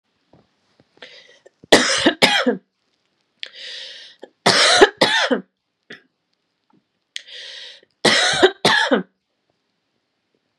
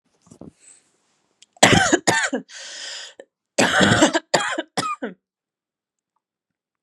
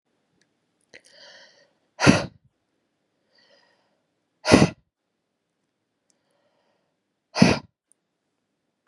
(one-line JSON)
{"three_cough_length": "10.6 s", "three_cough_amplitude": 32768, "three_cough_signal_mean_std_ratio": 0.38, "cough_length": "6.8 s", "cough_amplitude": 32768, "cough_signal_mean_std_ratio": 0.39, "exhalation_length": "8.9 s", "exhalation_amplitude": 32712, "exhalation_signal_mean_std_ratio": 0.19, "survey_phase": "beta (2021-08-13 to 2022-03-07)", "age": "18-44", "gender": "Female", "wearing_mask": "No", "symptom_cough_any": true, "symptom_runny_or_blocked_nose": true, "symptom_sore_throat": true, "symptom_fatigue": true, "symptom_headache": true, "smoker_status": "Ex-smoker", "respiratory_condition_asthma": false, "respiratory_condition_other": false, "recruitment_source": "Test and Trace", "submission_delay": "2 days", "covid_test_result": "Positive", "covid_test_method": "RT-qPCR", "covid_ct_value": 19.0, "covid_ct_gene": "ORF1ab gene", "covid_ct_mean": 19.4, "covid_viral_load": "440000 copies/ml", "covid_viral_load_category": "Low viral load (10K-1M copies/ml)"}